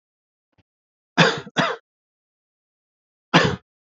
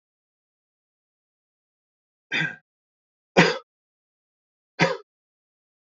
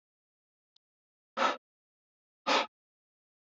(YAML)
cough_length: 3.9 s
cough_amplitude: 28022
cough_signal_mean_std_ratio: 0.28
three_cough_length: 5.9 s
three_cough_amplitude: 27042
three_cough_signal_mean_std_ratio: 0.21
exhalation_length: 3.6 s
exhalation_amplitude: 5714
exhalation_signal_mean_std_ratio: 0.24
survey_phase: beta (2021-08-13 to 2022-03-07)
age: 45-64
gender: Male
wearing_mask: 'No'
symptom_cough_any: true
symptom_onset: 12 days
smoker_status: Never smoked
respiratory_condition_asthma: false
respiratory_condition_other: false
recruitment_source: REACT
submission_delay: 1 day
covid_test_result: Negative
covid_test_method: RT-qPCR